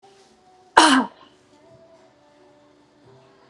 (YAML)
cough_length: 3.5 s
cough_amplitude: 32768
cough_signal_mean_std_ratio: 0.24
survey_phase: beta (2021-08-13 to 2022-03-07)
age: 45-64
gender: Female
wearing_mask: 'No'
symptom_none: true
smoker_status: Ex-smoker
respiratory_condition_asthma: false
respiratory_condition_other: false
recruitment_source: REACT
submission_delay: 4 days
covid_test_result: Negative
covid_test_method: RT-qPCR
covid_ct_value: 46.0
covid_ct_gene: N gene